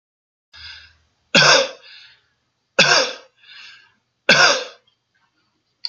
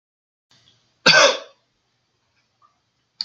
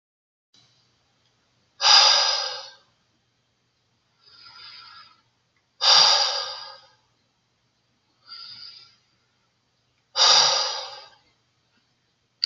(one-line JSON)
{"three_cough_length": "5.9 s", "three_cough_amplitude": 32767, "three_cough_signal_mean_std_ratio": 0.34, "cough_length": "3.2 s", "cough_amplitude": 30299, "cough_signal_mean_std_ratio": 0.25, "exhalation_length": "12.5 s", "exhalation_amplitude": 26198, "exhalation_signal_mean_std_ratio": 0.32, "survey_phase": "alpha (2021-03-01 to 2021-08-12)", "age": "45-64", "gender": "Male", "wearing_mask": "No", "symptom_none": true, "smoker_status": "Ex-smoker", "respiratory_condition_asthma": true, "respiratory_condition_other": false, "recruitment_source": "REACT", "submission_delay": "1 day", "covid_test_result": "Negative", "covid_test_method": "RT-qPCR"}